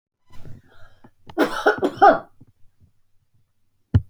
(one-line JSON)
{"cough_length": "4.1 s", "cough_amplitude": 29063, "cough_signal_mean_std_ratio": 0.32, "survey_phase": "alpha (2021-03-01 to 2021-08-12)", "age": "45-64", "gender": "Female", "wearing_mask": "No", "symptom_none": true, "smoker_status": "Ex-smoker", "respiratory_condition_asthma": false, "respiratory_condition_other": false, "recruitment_source": "REACT", "submission_delay": "1 day", "covid_test_result": "Negative", "covid_test_method": "RT-qPCR"}